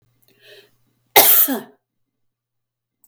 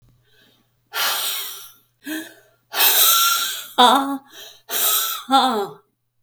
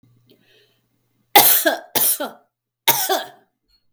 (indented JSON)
{
  "cough_length": "3.1 s",
  "cough_amplitude": 32768,
  "cough_signal_mean_std_ratio": 0.29,
  "exhalation_length": "6.2 s",
  "exhalation_amplitude": 31453,
  "exhalation_signal_mean_std_ratio": 0.55,
  "three_cough_length": "3.9 s",
  "three_cough_amplitude": 32768,
  "three_cough_signal_mean_std_ratio": 0.38,
  "survey_phase": "beta (2021-08-13 to 2022-03-07)",
  "age": "65+",
  "gender": "Female",
  "wearing_mask": "No",
  "symptom_runny_or_blocked_nose": true,
  "smoker_status": "Never smoked",
  "respiratory_condition_asthma": false,
  "respiratory_condition_other": false,
  "recruitment_source": "REACT",
  "submission_delay": "12 days",
  "covid_test_result": "Negative",
  "covid_test_method": "RT-qPCR",
  "influenza_a_test_result": "Negative",
  "influenza_b_test_result": "Negative"
}